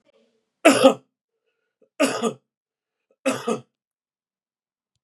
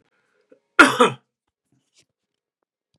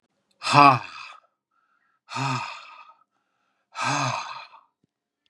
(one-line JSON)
{"three_cough_length": "5.0 s", "three_cough_amplitude": 32432, "three_cough_signal_mean_std_ratio": 0.27, "cough_length": "3.0 s", "cough_amplitude": 32768, "cough_signal_mean_std_ratio": 0.21, "exhalation_length": "5.3 s", "exhalation_amplitude": 30795, "exhalation_signal_mean_std_ratio": 0.31, "survey_phase": "beta (2021-08-13 to 2022-03-07)", "age": "45-64", "gender": "Male", "wearing_mask": "No", "symptom_cough_any": true, "symptom_runny_or_blocked_nose": true, "symptom_sore_throat": true, "symptom_headache": true, "symptom_onset": "4 days", "smoker_status": "Never smoked", "respiratory_condition_asthma": false, "respiratory_condition_other": false, "recruitment_source": "Test and Trace", "submission_delay": "2 days", "covid_test_result": "Positive", "covid_test_method": "RT-qPCR", "covid_ct_value": 21.3, "covid_ct_gene": "ORF1ab gene"}